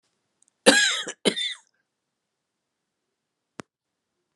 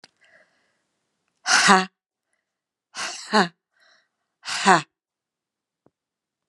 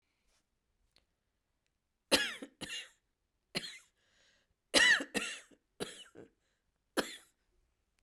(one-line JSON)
{"cough_length": "4.4 s", "cough_amplitude": 30833, "cough_signal_mean_std_ratio": 0.26, "exhalation_length": "6.5 s", "exhalation_amplitude": 32767, "exhalation_signal_mean_std_ratio": 0.27, "three_cough_length": "8.0 s", "three_cough_amplitude": 8317, "three_cough_signal_mean_std_ratio": 0.26, "survey_phase": "beta (2021-08-13 to 2022-03-07)", "age": "45-64", "gender": "Female", "wearing_mask": "No", "symptom_none": true, "smoker_status": "Never smoked", "respiratory_condition_asthma": false, "respiratory_condition_other": false, "recruitment_source": "REACT", "submission_delay": "1 day", "covid_test_result": "Negative", "covid_test_method": "RT-qPCR", "influenza_a_test_result": "Negative", "influenza_b_test_result": "Negative"}